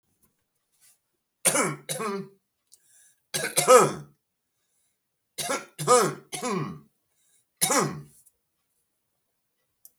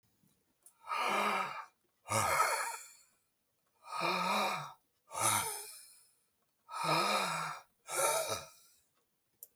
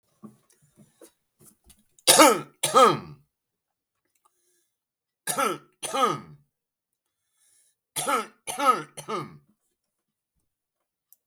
{"three_cough_length": "10.0 s", "three_cough_amplitude": 26886, "three_cough_signal_mean_std_ratio": 0.33, "exhalation_length": "9.6 s", "exhalation_amplitude": 5186, "exhalation_signal_mean_std_ratio": 0.57, "cough_length": "11.3 s", "cough_amplitude": 32766, "cough_signal_mean_std_ratio": 0.29, "survey_phase": "beta (2021-08-13 to 2022-03-07)", "age": "45-64", "gender": "Male", "wearing_mask": "Yes", "symptom_none": true, "smoker_status": "Never smoked", "respiratory_condition_asthma": false, "respiratory_condition_other": true, "recruitment_source": "REACT", "submission_delay": "3 days", "covid_test_result": "Negative", "covid_test_method": "RT-qPCR"}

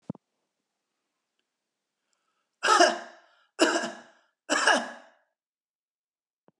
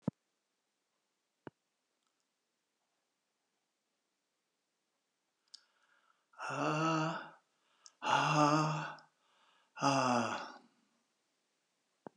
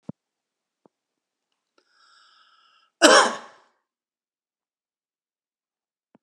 {"three_cough_length": "6.6 s", "three_cough_amplitude": 15623, "three_cough_signal_mean_std_ratio": 0.29, "exhalation_length": "12.2 s", "exhalation_amplitude": 6121, "exhalation_signal_mean_std_ratio": 0.34, "cough_length": "6.2 s", "cough_amplitude": 32768, "cough_signal_mean_std_ratio": 0.17, "survey_phase": "alpha (2021-03-01 to 2021-08-12)", "age": "65+", "gender": "Male", "wearing_mask": "No", "symptom_none": true, "smoker_status": "Never smoked", "respiratory_condition_asthma": false, "respiratory_condition_other": false, "recruitment_source": "REACT", "submission_delay": "1 day", "covid_test_result": "Negative", "covid_test_method": "RT-qPCR", "covid_ct_value": 5.0, "covid_ct_gene": "N gene"}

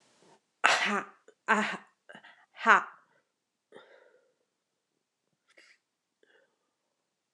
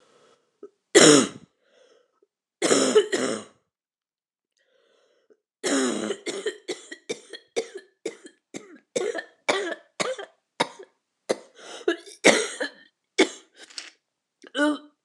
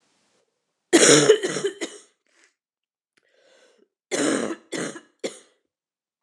{"exhalation_length": "7.3 s", "exhalation_amplitude": 28334, "exhalation_signal_mean_std_ratio": 0.23, "three_cough_length": "15.0 s", "three_cough_amplitude": 28363, "three_cough_signal_mean_std_ratio": 0.34, "cough_length": "6.2 s", "cough_amplitude": 29203, "cough_signal_mean_std_ratio": 0.33, "survey_phase": "alpha (2021-03-01 to 2021-08-12)", "age": "45-64", "gender": "Female", "wearing_mask": "No", "symptom_new_continuous_cough": true, "symptom_shortness_of_breath": true, "symptom_fatigue": true, "symptom_fever_high_temperature": true, "symptom_headache": true, "symptom_change_to_sense_of_smell_or_taste": true, "symptom_loss_of_taste": true, "symptom_onset": "5 days", "smoker_status": "Never smoked", "respiratory_condition_asthma": false, "respiratory_condition_other": false, "recruitment_source": "Test and Trace", "submission_delay": "3 days", "covid_test_result": "Positive", "covid_test_method": "RT-qPCR", "covid_ct_value": 16.8, "covid_ct_gene": "N gene", "covid_ct_mean": 17.1, "covid_viral_load": "2400000 copies/ml", "covid_viral_load_category": "High viral load (>1M copies/ml)"}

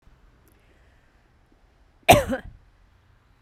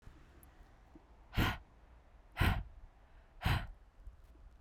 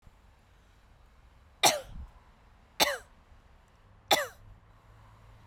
{"cough_length": "3.4 s", "cough_amplitude": 32767, "cough_signal_mean_std_ratio": 0.2, "exhalation_length": "4.6 s", "exhalation_amplitude": 3917, "exhalation_signal_mean_std_ratio": 0.39, "three_cough_length": "5.5 s", "three_cough_amplitude": 16285, "three_cough_signal_mean_std_ratio": 0.27, "survey_phase": "beta (2021-08-13 to 2022-03-07)", "age": "18-44", "gender": "Female", "wearing_mask": "No", "symptom_none": true, "smoker_status": "Never smoked", "respiratory_condition_asthma": false, "respiratory_condition_other": false, "recruitment_source": "REACT", "submission_delay": "1 day", "covid_test_result": "Negative", "covid_test_method": "RT-qPCR"}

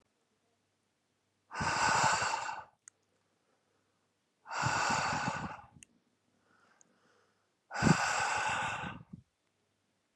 {"exhalation_length": "10.2 s", "exhalation_amplitude": 7553, "exhalation_signal_mean_std_ratio": 0.46, "survey_phase": "alpha (2021-03-01 to 2021-08-12)", "age": "18-44", "gender": "Male", "wearing_mask": "No", "symptom_none": true, "smoker_status": "Never smoked", "respiratory_condition_asthma": false, "respiratory_condition_other": false, "recruitment_source": "REACT", "submission_delay": "1 day", "covid_test_result": "Negative", "covid_test_method": "RT-qPCR"}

